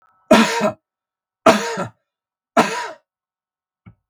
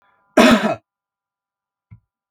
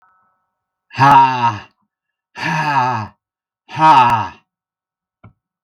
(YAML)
three_cough_length: 4.1 s
three_cough_amplitude: 32768
three_cough_signal_mean_std_ratio: 0.35
cough_length: 2.3 s
cough_amplitude: 32768
cough_signal_mean_std_ratio: 0.3
exhalation_length: 5.6 s
exhalation_amplitude: 32768
exhalation_signal_mean_std_ratio: 0.44
survey_phase: beta (2021-08-13 to 2022-03-07)
age: 45-64
gender: Male
wearing_mask: 'No'
symptom_none: true
smoker_status: Never smoked
respiratory_condition_asthma: false
respiratory_condition_other: false
recruitment_source: REACT
submission_delay: 1 day
covid_test_result: Negative
covid_test_method: RT-qPCR
influenza_a_test_result: Unknown/Void
influenza_b_test_result: Unknown/Void